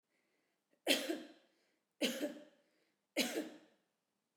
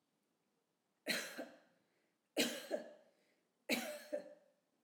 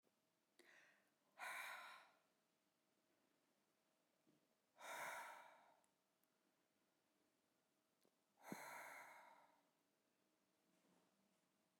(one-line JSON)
{"three_cough_length": "4.4 s", "three_cough_amplitude": 4826, "three_cough_signal_mean_std_ratio": 0.36, "cough_length": "4.8 s", "cough_amplitude": 2952, "cough_signal_mean_std_ratio": 0.38, "exhalation_length": "11.8 s", "exhalation_amplitude": 321, "exhalation_signal_mean_std_ratio": 0.4, "survey_phase": "alpha (2021-03-01 to 2021-08-12)", "age": "65+", "gender": "Female", "wearing_mask": "No", "symptom_none": true, "smoker_status": "Current smoker (1 to 10 cigarettes per day)", "respiratory_condition_asthma": false, "respiratory_condition_other": false, "recruitment_source": "REACT", "submission_delay": "2 days", "covid_test_result": "Negative", "covid_test_method": "RT-qPCR"}